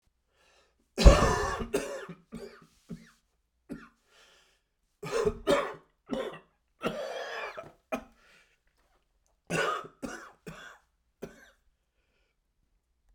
three_cough_length: 13.1 s
three_cough_amplitude: 21921
three_cough_signal_mean_std_ratio: 0.28
survey_phase: beta (2021-08-13 to 2022-03-07)
age: 45-64
gender: Male
wearing_mask: 'No'
symptom_cough_any: true
symptom_shortness_of_breath: true
symptom_diarrhoea: true
symptom_fatigue: true
symptom_change_to_sense_of_smell_or_taste: true
symptom_onset: 6 days
smoker_status: Ex-smoker
respiratory_condition_asthma: false
respiratory_condition_other: false
recruitment_source: Test and Trace
submission_delay: 1 day
covid_test_result: Positive
covid_test_method: RT-qPCR
covid_ct_value: 14.8
covid_ct_gene: ORF1ab gene
covid_ct_mean: 15.2
covid_viral_load: 10000000 copies/ml
covid_viral_load_category: High viral load (>1M copies/ml)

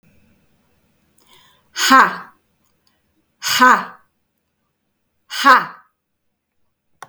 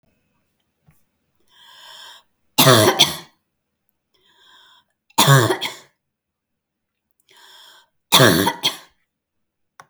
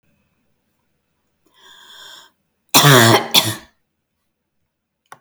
exhalation_length: 7.1 s
exhalation_amplitude: 32768
exhalation_signal_mean_std_ratio: 0.29
three_cough_length: 9.9 s
three_cough_amplitude: 32768
three_cough_signal_mean_std_ratio: 0.3
cough_length: 5.2 s
cough_amplitude: 32768
cough_signal_mean_std_ratio: 0.29
survey_phase: beta (2021-08-13 to 2022-03-07)
age: 18-44
gender: Female
wearing_mask: 'No'
symptom_none: true
smoker_status: Ex-smoker
respiratory_condition_asthma: false
respiratory_condition_other: false
recruitment_source: REACT
submission_delay: 2 days
covid_test_result: Negative
covid_test_method: RT-qPCR
influenza_a_test_result: Negative
influenza_b_test_result: Negative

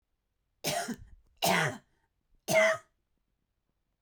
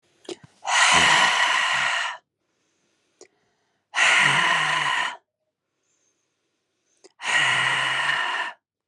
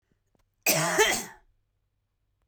three_cough_length: 4.0 s
three_cough_amplitude: 6635
three_cough_signal_mean_std_ratio: 0.37
exhalation_length: 8.9 s
exhalation_amplitude: 18752
exhalation_signal_mean_std_ratio: 0.58
cough_length: 2.5 s
cough_amplitude: 13941
cough_signal_mean_std_ratio: 0.38
survey_phase: beta (2021-08-13 to 2022-03-07)
age: 45-64
gender: Female
wearing_mask: 'No'
symptom_cough_any: true
symptom_new_continuous_cough: true
symptom_runny_or_blocked_nose: true
symptom_abdominal_pain: true
symptom_diarrhoea: true
symptom_fatigue: true
symptom_fever_high_temperature: true
symptom_headache: true
symptom_change_to_sense_of_smell_or_taste: true
symptom_other: true
symptom_onset: 3 days
smoker_status: Never smoked
respiratory_condition_asthma: false
respiratory_condition_other: false
recruitment_source: Test and Trace
submission_delay: 2 days
covid_test_result: Positive
covid_test_method: RT-qPCR
covid_ct_value: 23.9
covid_ct_gene: ORF1ab gene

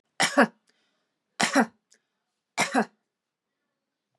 three_cough_length: 4.2 s
three_cough_amplitude: 21240
three_cough_signal_mean_std_ratio: 0.29
survey_phase: beta (2021-08-13 to 2022-03-07)
age: 45-64
gender: Female
wearing_mask: 'No'
symptom_none: true
smoker_status: Never smoked
respiratory_condition_asthma: false
respiratory_condition_other: false
recruitment_source: REACT
submission_delay: 0 days
covid_test_result: Negative
covid_test_method: RT-qPCR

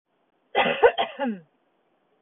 cough_length: 2.2 s
cough_amplitude: 21902
cough_signal_mean_std_ratio: 0.38
survey_phase: beta (2021-08-13 to 2022-03-07)
age: 45-64
gender: Female
wearing_mask: 'No'
symptom_none: true
smoker_status: Never smoked
respiratory_condition_asthma: false
respiratory_condition_other: false
recruitment_source: REACT
submission_delay: 4 days
covid_test_result: Negative
covid_test_method: RT-qPCR
influenza_a_test_result: Negative
influenza_b_test_result: Negative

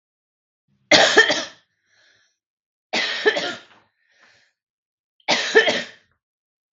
three_cough_length: 6.7 s
three_cough_amplitude: 32766
three_cough_signal_mean_std_ratio: 0.34
survey_phase: beta (2021-08-13 to 2022-03-07)
age: 18-44
gender: Female
wearing_mask: 'No'
symptom_none: true
smoker_status: Current smoker (1 to 10 cigarettes per day)
respiratory_condition_asthma: false
respiratory_condition_other: false
recruitment_source: REACT
submission_delay: 1 day
covid_test_result: Negative
covid_test_method: RT-qPCR
influenza_a_test_result: Negative
influenza_b_test_result: Negative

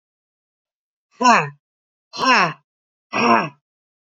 exhalation_length: 4.2 s
exhalation_amplitude: 28309
exhalation_signal_mean_std_ratio: 0.36
survey_phase: beta (2021-08-13 to 2022-03-07)
age: 45-64
gender: Female
wearing_mask: 'No'
symptom_cough_any: true
symptom_runny_or_blocked_nose: true
symptom_sore_throat: true
symptom_fatigue: true
symptom_headache: true
symptom_change_to_sense_of_smell_or_taste: true
symptom_onset: 3 days
smoker_status: Never smoked
respiratory_condition_asthma: false
respiratory_condition_other: false
recruitment_source: Test and Trace
submission_delay: 1 day
covid_test_result: Positive
covid_test_method: ePCR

